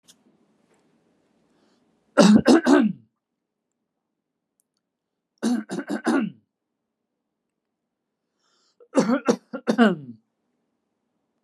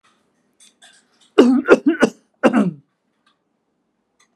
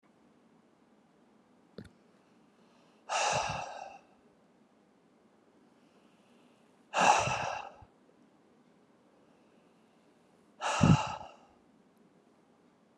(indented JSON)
{
  "three_cough_length": "11.4 s",
  "three_cough_amplitude": 29180,
  "three_cough_signal_mean_std_ratio": 0.3,
  "cough_length": "4.4 s",
  "cough_amplitude": 32768,
  "cough_signal_mean_std_ratio": 0.33,
  "exhalation_length": "13.0 s",
  "exhalation_amplitude": 9912,
  "exhalation_signal_mean_std_ratio": 0.29,
  "survey_phase": "beta (2021-08-13 to 2022-03-07)",
  "age": "65+",
  "gender": "Male",
  "wearing_mask": "No",
  "symptom_none": true,
  "smoker_status": "Never smoked",
  "respiratory_condition_asthma": false,
  "respiratory_condition_other": false,
  "recruitment_source": "REACT",
  "submission_delay": "6 days",
  "covid_test_result": "Negative",
  "covid_test_method": "RT-qPCR"
}